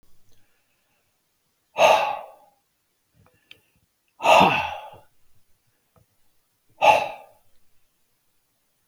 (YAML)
exhalation_length: 8.9 s
exhalation_amplitude: 26078
exhalation_signal_mean_std_ratio: 0.28
survey_phase: beta (2021-08-13 to 2022-03-07)
age: 65+
gender: Male
wearing_mask: 'No'
symptom_none: true
smoker_status: Never smoked
respiratory_condition_asthma: false
respiratory_condition_other: false
recruitment_source: REACT
submission_delay: 1 day
covid_test_result: Negative
covid_test_method: RT-qPCR